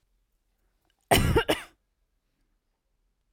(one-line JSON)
{"cough_length": "3.3 s", "cough_amplitude": 19173, "cough_signal_mean_std_ratio": 0.28, "survey_phase": "alpha (2021-03-01 to 2021-08-12)", "age": "18-44", "gender": "Female", "wearing_mask": "No", "symptom_none": true, "smoker_status": "Never smoked", "respiratory_condition_asthma": false, "respiratory_condition_other": false, "recruitment_source": "REACT", "submission_delay": "1 day", "covid_test_result": "Negative", "covid_test_method": "RT-qPCR"}